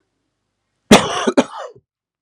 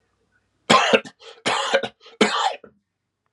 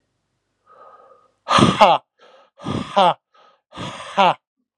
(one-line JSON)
{"cough_length": "2.2 s", "cough_amplitude": 32768, "cough_signal_mean_std_ratio": 0.31, "three_cough_length": "3.3 s", "three_cough_amplitude": 32382, "three_cough_signal_mean_std_ratio": 0.42, "exhalation_length": "4.8 s", "exhalation_amplitude": 32768, "exhalation_signal_mean_std_ratio": 0.35, "survey_phase": "alpha (2021-03-01 to 2021-08-12)", "age": "18-44", "gender": "Male", "wearing_mask": "No", "symptom_cough_any": true, "symptom_headache": true, "symptom_change_to_sense_of_smell_or_taste": true, "symptom_onset": "3 days", "smoker_status": "Ex-smoker", "respiratory_condition_asthma": false, "respiratory_condition_other": false, "recruitment_source": "Test and Trace", "submission_delay": "2 days", "covid_test_result": "Positive", "covid_test_method": "RT-qPCR", "covid_ct_value": 9.7, "covid_ct_gene": "N gene", "covid_ct_mean": 10.0, "covid_viral_load": "510000000 copies/ml", "covid_viral_load_category": "High viral load (>1M copies/ml)"}